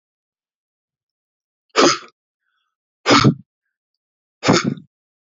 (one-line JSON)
{"exhalation_length": "5.2 s", "exhalation_amplitude": 29661, "exhalation_signal_mean_std_ratio": 0.29, "survey_phase": "beta (2021-08-13 to 2022-03-07)", "age": "45-64", "gender": "Male", "wearing_mask": "No", "symptom_none": true, "symptom_onset": "5 days", "smoker_status": "Never smoked", "respiratory_condition_asthma": false, "respiratory_condition_other": false, "recruitment_source": "Test and Trace", "submission_delay": "1 day", "covid_test_result": "Positive", "covid_test_method": "RT-qPCR", "covid_ct_value": 17.4, "covid_ct_gene": "ORF1ab gene", "covid_ct_mean": 17.6, "covid_viral_load": "1700000 copies/ml", "covid_viral_load_category": "High viral load (>1M copies/ml)"}